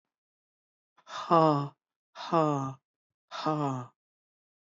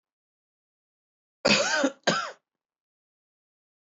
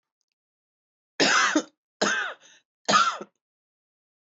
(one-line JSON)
{"exhalation_length": "4.6 s", "exhalation_amplitude": 11792, "exhalation_signal_mean_std_ratio": 0.37, "cough_length": "3.8 s", "cough_amplitude": 12572, "cough_signal_mean_std_ratio": 0.32, "three_cough_length": "4.4 s", "three_cough_amplitude": 13638, "three_cough_signal_mean_std_ratio": 0.38, "survey_phase": "beta (2021-08-13 to 2022-03-07)", "age": "45-64", "gender": "Female", "wearing_mask": "No", "symptom_cough_any": true, "symptom_sore_throat": true, "symptom_change_to_sense_of_smell_or_taste": true, "smoker_status": "Ex-smoker", "respiratory_condition_asthma": false, "respiratory_condition_other": false, "recruitment_source": "Test and Trace", "submission_delay": "1 day", "covid_test_result": "Positive", "covid_test_method": "RT-qPCR", "covid_ct_value": 12.1, "covid_ct_gene": "ORF1ab gene", "covid_ct_mean": 12.9, "covid_viral_load": "61000000 copies/ml", "covid_viral_load_category": "High viral load (>1M copies/ml)"}